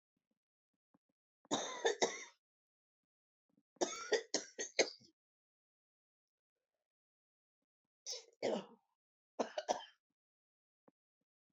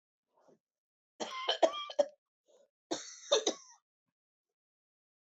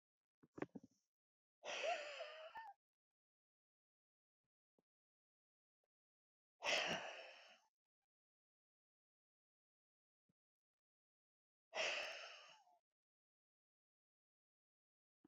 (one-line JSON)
{"three_cough_length": "11.5 s", "three_cough_amplitude": 4515, "three_cough_signal_mean_std_ratio": 0.27, "cough_length": "5.4 s", "cough_amplitude": 6586, "cough_signal_mean_std_ratio": 0.28, "exhalation_length": "15.3 s", "exhalation_amplitude": 1416, "exhalation_signal_mean_std_ratio": 0.28, "survey_phase": "beta (2021-08-13 to 2022-03-07)", "age": "45-64", "gender": "Female", "wearing_mask": "No", "symptom_runny_or_blocked_nose": true, "symptom_onset": "7 days", "smoker_status": "Never smoked", "respiratory_condition_asthma": true, "respiratory_condition_other": false, "recruitment_source": "REACT", "submission_delay": "1 day", "covid_test_result": "Negative", "covid_test_method": "RT-qPCR"}